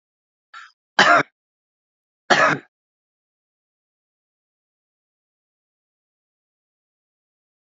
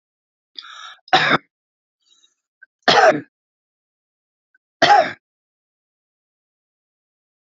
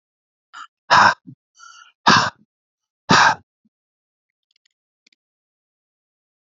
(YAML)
cough_length: 7.7 s
cough_amplitude: 32767
cough_signal_mean_std_ratio: 0.2
three_cough_length: 7.6 s
three_cough_amplitude: 30999
three_cough_signal_mean_std_ratio: 0.26
exhalation_length: 6.5 s
exhalation_amplitude: 30307
exhalation_signal_mean_std_ratio: 0.26
survey_phase: beta (2021-08-13 to 2022-03-07)
age: 65+
gender: Male
wearing_mask: 'No'
symptom_none: true
smoker_status: Current smoker (e-cigarettes or vapes only)
respiratory_condition_asthma: false
respiratory_condition_other: false
recruitment_source: REACT
submission_delay: 2 days
covid_test_result: Negative
covid_test_method: RT-qPCR